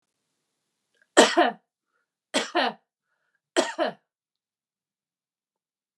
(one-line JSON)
{"three_cough_length": "6.0 s", "three_cough_amplitude": 30934, "three_cough_signal_mean_std_ratio": 0.26, "survey_phase": "beta (2021-08-13 to 2022-03-07)", "age": "65+", "gender": "Female", "wearing_mask": "No", "symptom_none": true, "smoker_status": "Never smoked", "respiratory_condition_asthma": false, "respiratory_condition_other": false, "recruitment_source": "REACT", "submission_delay": "2 days", "covid_test_result": "Negative", "covid_test_method": "RT-qPCR", "influenza_a_test_result": "Unknown/Void", "influenza_b_test_result": "Unknown/Void"}